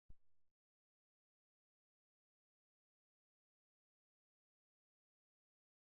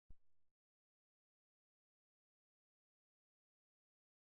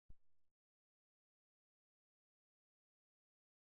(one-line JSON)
{"exhalation_length": "5.9 s", "exhalation_amplitude": 132, "exhalation_signal_mean_std_ratio": 0.17, "three_cough_length": "4.3 s", "three_cough_amplitude": 130, "three_cough_signal_mean_std_ratio": 0.21, "cough_length": "3.6 s", "cough_amplitude": 134, "cough_signal_mean_std_ratio": 0.23, "survey_phase": "beta (2021-08-13 to 2022-03-07)", "age": "65+", "gender": "Male", "wearing_mask": "No", "symptom_none": true, "smoker_status": "Ex-smoker", "respiratory_condition_asthma": false, "respiratory_condition_other": false, "recruitment_source": "REACT", "submission_delay": "2 days", "covid_test_result": "Negative", "covid_test_method": "RT-qPCR", "influenza_a_test_result": "Negative", "influenza_b_test_result": "Negative"}